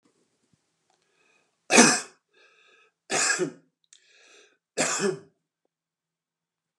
{
  "three_cough_length": "6.8 s",
  "three_cough_amplitude": 29199,
  "three_cough_signal_mean_std_ratio": 0.28,
  "survey_phase": "beta (2021-08-13 to 2022-03-07)",
  "age": "65+",
  "gender": "Male",
  "wearing_mask": "No",
  "symptom_none": true,
  "smoker_status": "Ex-smoker",
  "respiratory_condition_asthma": false,
  "respiratory_condition_other": false,
  "recruitment_source": "REACT",
  "submission_delay": "1 day",
  "covid_test_result": "Negative",
  "covid_test_method": "RT-qPCR"
}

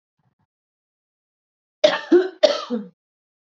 {
  "cough_length": "3.4 s",
  "cough_amplitude": 28474,
  "cough_signal_mean_std_ratio": 0.3,
  "survey_phase": "beta (2021-08-13 to 2022-03-07)",
  "age": "45-64",
  "gender": "Female",
  "wearing_mask": "No",
  "symptom_none": true,
  "smoker_status": "Current smoker (1 to 10 cigarettes per day)",
  "respiratory_condition_asthma": false,
  "respiratory_condition_other": false,
  "recruitment_source": "REACT",
  "submission_delay": "0 days",
  "covid_test_result": "Negative",
  "covid_test_method": "RT-qPCR",
  "influenza_a_test_result": "Unknown/Void",
  "influenza_b_test_result": "Unknown/Void"
}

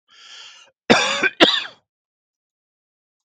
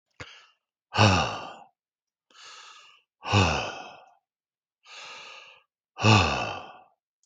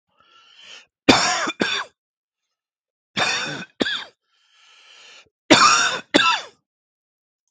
{
  "cough_length": "3.2 s",
  "cough_amplitude": 32768,
  "cough_signal_mean_std_ratio": 0.32,
  "exhalation_length": "7.3 s",
  "exhalation_amplitude": 22124,
  "exhalation_signal_mean_std_ratio": 0.36,
  "three_cough_length": "7.5 s",
  "three_cough_amplitude": 32768,
  "three_cough_signal_mean_std_ratio": 0.38,
  "survey_phase": "beta (2021-08-13 to 2022-03-07)",
  "age": "45-64",
  "gender": "Male",
  "wearing_mask": "No",
  "symptom_none": true,
  "smoker_status": "Ex-smoker",
  "respiratory_condition_asthma": false,
  "respiratory_condition_other": false,
  "recruitment_source": "REACT",
  "submission_delay": "3 days",
  "covid_test_result": "Negative",
  "covid_test_method": "RT-qPCR",
  "influenza_a_test_result": "Negative",
  "influenza_b_test_result": "Negative"
}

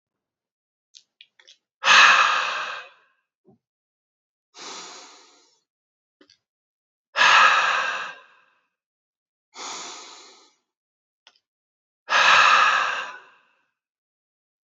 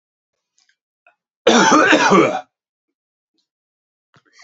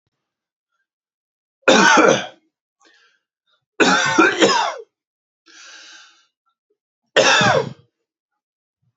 {
  "exhalation_length": "14.7 s",
  "exhalation_amplitude": 26627,
  "exhalation_signal_mean_std_ratio": 0.34,
  "cough_length": "4.4 s",
  "cough_amplitude": 32768,
  "cough_signal_mean_std_ratio": 0.37,
  "three_cough_length": "9.0 s",
  "three_cough_amplitude": 30343,
  "three_cough_signal_mean_std_ratio": 0.38,
  "survey_phase": "beta (2021-08-13 to 2022-03-07)",
  "age": "45-64",
  "gender": "Male",
  "wearing_mask": "No",
  "symptom_none": true,
  "smoker_status": "Never smoked",
  "respiratory_condition_asthma": false,
  "respiratory_condition_other": false,
  "recruitment_source": "REACT",
  "submission_delay": "2 days",
  "covid_test_result": "Negative",
  "covid_test_method": "RT-qPCR"
}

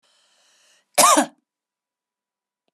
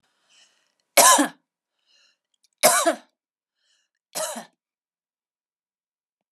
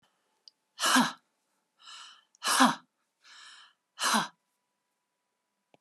{
  "cough_length": "2.7 s",
  "cough_amplitude": 31427,
  "cough_signal_mean_std_ratio": 0.25,
  "three_cough_length": "6.3 s",
  "three_cough_amplitude": 30696,
  "three_cough_signal_mean_std_ratio": 0.25,
  "exhalation_length": "5.8 s",
  "exhalation_amplitude": 13866,
  "exhalation_signal_mean_std_ratio": 0.31,
  "survey_phase": "beta (2021-08-13 to 2022-03-07)",
  "age": "45-64",
  "gender": "Female",
  "wearing_mask": "No",
  "symptom_none": true,
  "smoker_status": "Never smoked",
  "respiratory_condition_asthma": false,
  "respiratory_condition_other": false,
  "recruitment_source": "REACT",
  "submission_delay": "2 days",
  "covid_test_result": "Negative",
  "covid_test_method": "RT-qPCR",
  "influenza_a_test_result": "Negative",
  "influenza_b_test_result": "Negative"
}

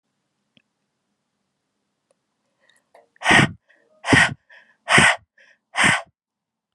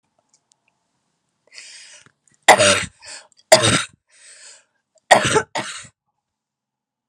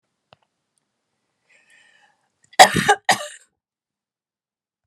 {
  "exhalation_length": "6.7 s",
  "exhalation_amplitude": 32563,
  "exhalation_signal_mean_std_ratio": 0.3,
  "three_cough_length": "7.1 s",
  "three_cough_amplitude": 32768,
  "three_cough_signal_mean_std_ratio": 0.28,
  "cough_length": "4.9 s",
  "cough_amplitude": 32768,
  "cough_signal_mean_std_ratio": 0.19,
  "survey_phase": "alpha (2021-03-01 to 2021-08-12)",
  "age": "18-44",
  "gender": "Female",
  "wearing_mask": "No",
  "symptom_none": true,
  "smoker_status": "Current smoker (e-cigarettes or vapes only)",
  "respiratory_condition_asthma": false,
  "respiratory_condition_other": false,
  "recruitment_source": "REACT",
  "submission_delay": "3 days",
  "covid_test_result": "Negative",
  "covid_test_method": "RT-qPCR"
}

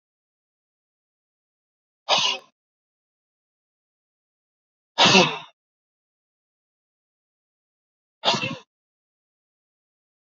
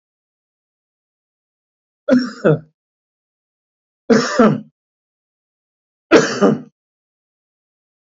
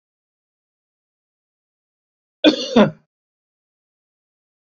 {
  "exhalation_length": "10.3 s",
  "exhalation_amplitude": 28597,
  "exhalation_signal_mean_std_ratio": 0.21,
  "three_cough_length": "8.2 s",
  "three_cough_amplitude": 29860,
  "three_cough_signal_mean_std_ratio": 0.29,
  "cough_length": "4.7 s",
  "cough_amplitude": 27436,
  "cough_signal_mean_std_ratio": 0.2,
  "survey_phase": "beta (2021-08-13 to 2022-03-07)",
  "age": "65+",
  "gender": "Male",
  "wearing_mask": "No",
  "symptom_none": true,
  "smoker_status": "Ex-smoker",
  "respiratory_condition_asthma": true,
  "respiratory_condition_other": false,
  "recruitment_source": "REACT",
  "submission_delay": "4 days",
  "covid_test_result": "Negative",
  "covid_test_method": "RT-qPCR",
  "influenza_a_test_result": "Negative",
  "influenza_b_test_result": "Negative"
}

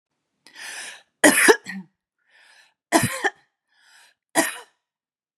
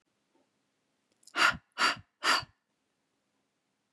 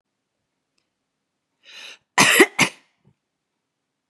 {
  "three_cough_length": "5.4 s",
  "three_cough_amplitude": 31874,
  "three_cough_signal_mean_std_ratio": 0.3,
  "exhalation_length": "3.9 s",
  "exhalation_amplitude": 10150,
  "exhalation_signal_mean_std_ratio": 0.29,
  "cough_length": "4.1 s",
  "cough_amplitude": 32767,
  "cough_signal_mean_std_ratio": 0.24,
  "survey_phase": "beta (2021-08-13 to 2022-03-07)",
  "age": "18-44",
  "gender": "Female",
  "wearing_mask": "No",
  "symptom_none": true,
  "smoker_status": "Never smoked",
  "respiratory_condition_asthma": false,
  "respiratory_condition_other": false,
  "recruitment_source": "REACT",
  "submission_delay": "1 day",
  "covid_test_result": "Negative",
  "covid_test_method": "RT-qPCR",
  "influenza_a_test_result": "Negative",
  "influenza_b_test_result": "Negative"
}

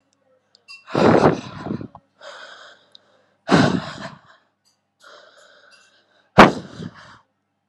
{
  "exhalation_length": "7.7 s",
  "exhalation_amplitude": 32768,
  "exhalation_signal_mean_std_ratio": 0.29,
  "survey_phase": "beta (2021-08-13 to 2022-03-07)",
  "age": "18-44",
  "gender": "Female",
  "wearing_mask": "No",
  "symptom_cough_any": true,
  "symptom_shortness_of_breath": true,
  "symptom_sore_throat": true,
  "symptom_change_to_sense_of_smell_or_taste": true,
  "symptom_loss_of_taste": true,
  "symptom_other": true,
  "symptom_onset": "3 days",
  "smoker_status": "Never smoked",
  "respiratory_condition_asthma": false,
  "respiratory_condition_other": false,
  "recruitment_source": "Test and Trace",
  "submission_delay": "1 day",
  "covid_test_result": "Positive",
  "covid_test_method": "RT-qPCR",
  "covid_ct_value": 21.8,
  "covid_ct_gene": "N gene"
}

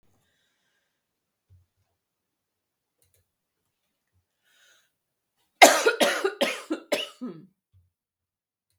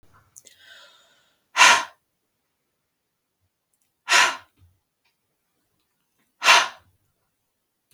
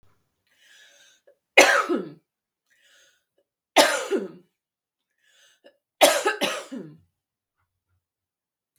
{
  "cough_length": "8.8 s",
  "cough_amplitude": 32768,
  "cough_signal_mean_std_ratio": 0.21,
  "exhalation_length": "7.9 s",
  "exhalation_amplitude": 32767,
  "exhalation_signal_mean_std_ratio": 0.23,
  "three_cough_length": "8.8 s",
  "three_cough_amplitude": 32768,
  "three_cough_signal_mean_std_ratio": 0.28,
  "survey_phase": "beta (2021-08-13 to 2022-03-07)",
  "age": "45-64",
  "gender": "Female",
  "wearing_mask": "No",
  "symptom_none": true,
  "smoker_status": "Never smoked",
  "respiratory_condition_asthma": true,
  "respiratory_condition_other": false,
  "recruitment_source": "REACT",
  "submission_delay": "2 days",
  "covid_test_result": "Negative",
  "covid_test_method": "RT-qPCR",
  "influenza_a_test_result": "Negative",
  "influenza_b_test_result": "Negative"
}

